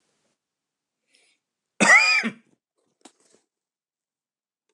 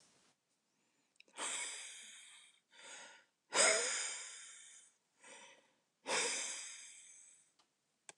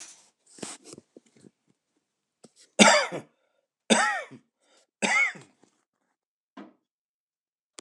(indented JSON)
{
  "cough_length": "4.7 s",
  "cough_amplitude": 21068,
  "cough_signal_mean_std_ratio": 0.25,
  "exhalation_length": "8.2 s",
  "exhalation_amplitude": 4339,
  "exhalation_signal_mean_std_ratio": 0.39,
  "three_cough_length": "7.8 s",
  "three_cough_amplitude": 28256,
  "three_cough_signal_mean_std_ratio": 0.27,
  "survey_phase": "beta (2021-08-13 to 2022-03-07)",
  "age": "45-64",
  "gender": "Male",
  "wearing_mask": "No",
  "symptom_none": true,
  "smoker_status": "Ex-smoker",
  "respiratory_condition_asthma": false,
  "respiratory_condition_other": false,
  "recruitment_source": "REACT",
  "submission_delay": "1 day",
  "covid_test_result": "Negative",
  "covid_test_method": "RT-qPCR"
}